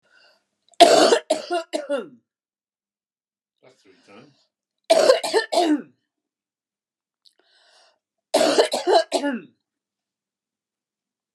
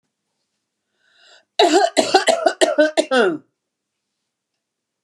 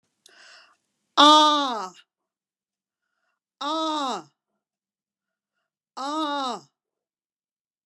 {"three_cough_length": "11.3 s", "three_cough_amplitude": 32766, "three_cough_signal_mean_std_ratio": 0.34, "cough_length": "5.0 s", "cough_amplitude": 32298, "cough_signal_mean_std_ratio": 0.4, "exhalation_length": "7.9 s", "exhalation_amplitude": 28626, "exhalation_signal_mean_std_ratio": 0.3, "survey_phase": "beta (2021-08-13 to 2022-03-07)", "age": "65+", "gender": "Female", "wearing_mask": "No", "symptom_cough_any": true, "symptom_runny_or_blocked_nose": true, "symptom_sore_throat": true, "symptom_onset": "5 days", "smoker_status": "Never smoked", "respiratory_condition_asthma": false, "respiratory_condition_other": false, "recruitment_source": "REACT", "submission_delay": "3 days", "covid_test_result": "Negative", "covid_test_method": "RT-qPCR", "influenza_a_test_result": "Negative", "influenza_b_test_result": "Negative"}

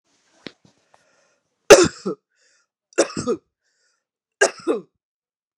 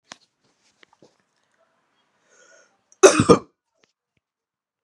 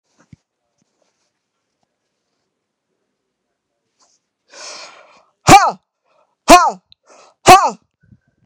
{"three_cough_length": "5.6 s", "three_cough_amplitude": 32768, "three_cough_signal_mean_std_ratio": 0.23, "cough_length": "4.8 s", "cough_amplitude": 32767, "cough_signal_mean_std_ratio": 0.18, "exhalation_length": "8.5 s", "exhalation_amplitude": 32768, "exhalation_signal_mean_std_ratio": 0.23, "survey_phase": "beta (2021-08-13 to 2022-03-07)", "age": "18-44", "gender": "Female", "wearing_mask": "No", "symptom_cough_any": true, "symptom_runny_or_blocked_nose": true, "symptom_fatigue": true, "symptom_other": true, "symptom_onset": "4 days", "smoker_status": "Never smoked", "respiratory_condition_asthma": true, "respiratory_condition_other": false, "recruitment_source": "Test and Trace", "submission_delay": "1 day", "covid_test_result": "Positive", "covid_test_method": "ePCR"}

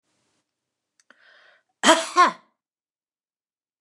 {"cough_length": "3.8 s", "cough_amplitude": 29203, "cough_signal_mean_std_ratio": 0.23, "survey_phase": "beta (2021-08-13 to 2022-03-07)", "age": "45-64", "gender": "Female", "wearing_mask": "No", "symptom_none": true, "smoker_status": "Ex-smoker", "respiratory_condition_asthma": false, "respiratory_condition_other": false, "recruitment_source": "REACT", "submission_delay": "1 day", "covid_test_result": "Negative", "covid_test_method": "RT-qPCR", "influenza_a_test_result": "Negative", "influenza_b_test_result": "Negative"}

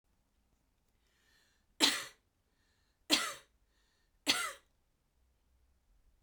{"three_cough_length": "6.2 s", "three_cough_amplitude": 7908, "three_cough_signal_mean_std_ratio": 0.24, "survey_phase": "beta (2021-08-13 to 2022-03-07)", "age": "18-44", "gender": "Female", "wearing_mask": "No", "symptom_none": true, "smoker_status": "Never smoked", "respiratory_condition_asthma": true, "respiratory_condition_other": false, "recruitment_source": "Test and Trace", "submission_delay": "1 day", "covid_test_result": "Positive", "covid_test_method": "LFT"}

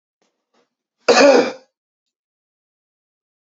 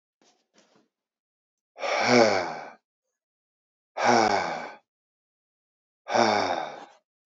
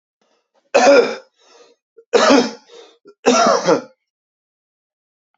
{"cough_length": "3.4 s", "cough_amplitude": 30319, "cough_signal_mean_std_ratio": 0.28, "exhalation_length": "7.3 s", "exhalation_amplitude": 15988, "exhalation_signal_mean_std_ratio": 0.4, "three_cough_length": "5.4 s", "three_cough_amplitude": 32767, "three_cough_signal_mean_std_ratio": 0.4, "survey_phase": "beta (2021-08-13 to 2022-03-07)", "age": "18-44", "gender": "Male", "wearing_mask": "No", "symptom_none": true, "smoker_status": "Ex-smoker", "respiratory_condition_asthma": false, "respiratory_condition_other": false, "recruitment_source": "REACT", "submission_delay": "1 day", "covid_test_result": "Negative", "covid_test_method": "RT-qPCR", "influenza_a_test_result": "Negative", "influenza_b_test_result": "Negative"}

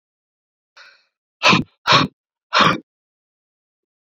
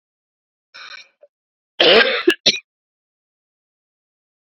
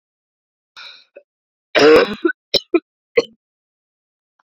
{"exhalation_length": "4.1 s", "exhalation_amplitude": 28541, "exhalation_signal_mean_std_ratio": 0.31, "cough_length": "4.4 s", "cough_amplitude": 31565, "cough_signal_mean_std_ratio": 0.28, "three_cough_length": "4.4 s", "three_cough_amplitude": 30832, "three_cough_signal_mean_std_ratio": 0.29, "survey_phase": "beta (2021-08-13 to 2022-03-07)", "age": "18-44", "gender": "Female", "wearing_mask": "No", "symptom_cough_any": true, "symptom_runny_or_blocked_nose": true, "symptom_sore_throat": true, "symptom_fatigue": true, "symptom_onset": "2 days", "smoker_status": "Never smoked", "respiratory_condition_asthma": false, "respiratory_condition_other": false, "recruitment_source": "Test and Trace", "submission_delay": "1 day", "covid_test_result": "Positive", "covid_test_method": "RT-qPCR"}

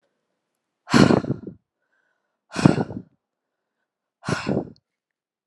{"exhalation_length": "5.5 s", "exhalation_amplitude": 32768, "exhalation_signal_mean_std_ratio": 0.28, "survey_phase": "alpha (2021-03-01 to 2021-08-12)", "age": "18-44", "gender": "Female", "wearing_mask": "No", "symptom_none": true, "smoker_status": "Never smoked", "respiratory_condition_asthma": false, "respiratory_condition_other": false, "recruitment_source": "REACT", "submission_delay": "1 day", "covid_test_result": "Negative", "covid_test_method": "RT-qPCR"}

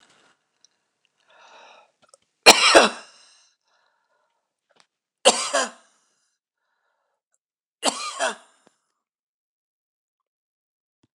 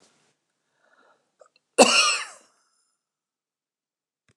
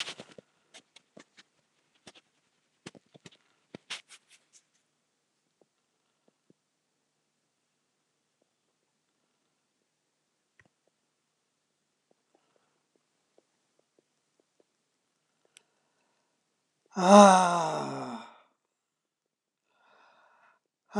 {"three_cough_length": "11.1 s", "three_cough_amplitude": 29204, "three_cough_signal_mean_std_ratio": 0.21, "cough_length": "4.4 s", "cough_amplitude": 29204, "cough_signal_mean_std_ratio": 0.23, "exhalation_length": "21.0 s", "exhalation_amplitude": 24597, "exhalation_signal_mean_std_ratio": 0.15, "survey_phase": "alpha (2021-03-01 to 2021-08-12)", "age": "65+", "gender": "Male", "wearing_mask": "No", "symptom_none": true, "smoker_status": "Ex-smoker", "respiratory_condition_asthma": false, "respiratory_condition_other": true, "recruitment_source": "REACT", "submission_delay": "1 day", "covid_test_result": "Negative", "covid_test_method": "RT-qPCR"}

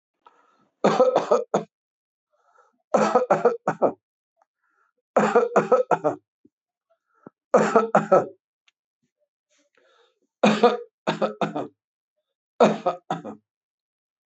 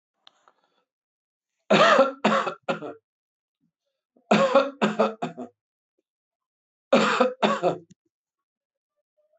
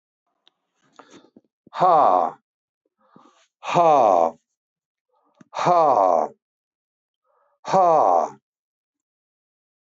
{"cough_length": "14.3 s", "cough_amplitude": 23979, "cough_signal_mean_std_ratio": 0.38, "three_cough_length": "9.4 s", "three_cough_amplitude": 19444, "three_cough_signal_mean_std_ratio": 0.38, "exhalation_length": "9.9 s", "exhalation_amplitude": 20644, "exhalation_signal_mean_std_ratio": 0.39, "survey_phase": "beta (2021-08-13 to 2022-03-07)", "age": "65+", "gender": "Male", "wearing_mask": "No", "symptom_none": true, "smoker_status": "Ex-smoker", "respiratory_condition_asthma": false, "respiratory_condition_other": false, "recruitment_source": "REACT", "submission_delay": "3 days", "covid_test_result": "Negative", "covid_test_method": "RT-qPCR", "influenza_a_test_result": "Negative", "influenza_b_test_result": "Negative"}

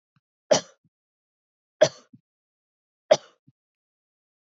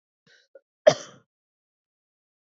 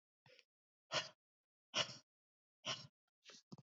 {"three_cough_length": "4.5 s", "three_cough_amplitude": 23590, "three_cough_signal_mean_std_ratio": 0.15, "cough_length": "2.6 s", "cough_amplitude": 26325, "cough_signal_mean_std_ratio": 0.12, "exhalation_length": "3.8 s", "exhalation_amplitude": 1744, "exhalation_signal_mean_std_ratio": 0.28, "survey_phase": "beta (2021-08-13 to 2022-03-07)", "age": "18-44", "gender": "Female", "wearing_mask": "No", "symptom_cough_any": true, "symptom_runny_or_blocked_nose": true, "symptom_other": true, "symptom_onset": "3 days", "smoker_status": "Never smoked", "respiratory_condition_asthma": false, "respiratory_condition_other": false, "recruitment_source": "Test and Trace", "submission_delay": "2 days", "covid_test_result": "Positive", "covid_test_method": "RT-qPCR", "covid_ct_value": 17.5, "covid_ct_gene": "ORF1ab gene", "covid_ct_mean": 18.0, "covid_viral_load": "1300000 copies/ml", "covid_viral_load_category": "High viral load (>1M copies/ml)"}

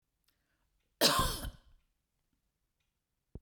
{"cough_length": "3.4 s", "cough_amplitude": 7975, "cough_signal_mean_std_ratio": 0.28, "survey_phase": "beta (2021-08-13 to 2022-03-07)", "age": "45-64", "gender": "Female", "wearing_mask": "No", "symptom_runny_or_blocked_nose": true, "symptom_onset": "5 days", "smoker_status": "Never smoked", "respiratory_condition_asthma": false, "respiratory_condition_other": false, "recruitment_source": "REACT", "submission_delay": "3 days", "covid_test_result": "Negative", "covid_test_method": "RT-qPCR", "influenza_a_test_result": "Negative", "influenza_b_test_result": "Negative"}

